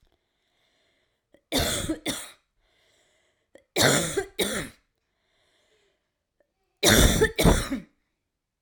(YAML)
three_cough_length: 8.6 s
three_cough_amplitude: 24024
three_cough_signal_mean_std_ratio: 0.36
survey_phase: alpha (2021-03-01 to 2021-08-12)
age: 18-44
gender: Female
wearing_mask: 'No'
symptom_cough_any: true
symptom_new_continuous_cough: true
symptom_shortness_of_breath: true
symptom_fatigue: true
symptom_fever_high_temperature: true
symptom_headache: true
symptom_onset: 3 days
smoker_status: Ex-smoker
respiratory_condition_asthma: true
respiratory_condition_other: false
recruitment_source: Test and Trace
submission_delay: 2 days
covid_test_result: Positive
covid_test_method: RT-qPCR